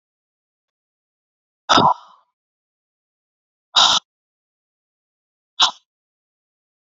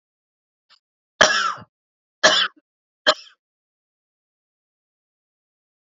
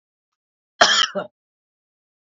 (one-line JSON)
{"exhalation_length": "6.9 s", "exhalation_amplitude": 29279, "exhalation_signal_mean_std_ratio": 0.23, "three_cough_length": "5.8 s", "three_cough_amplitude": 30112, "three_cough_signal_mean_std_ratio": 0.24, "cough_length": "2.2 s", "cough_amplitude": 28741, "cough_signal_mean_std_ratio": 0.29, "survey_phase": "beta (2021-08-13 to 2022-03-07)", "age": "18-44", "gender": "Male", "wearing_mask": "Yes", "symptom_cough_any": true, "symptom_sore_throat": true, "symptom_diarrhoea": true, "symptom_fatigue": true, "symptom_headache": true, "symptom_change_to_sense_of_smell_or_taste": true, "symptom_other": true, "smoker_status": "Ex-smoker", "respiratory_condition_asthma": false, "respiratory_condition_other": false, "recruitment_source": "Test and Trace", "submission_delay": "0 days", "covid_test_result": "Negative", "covid_test_method": "LFT"}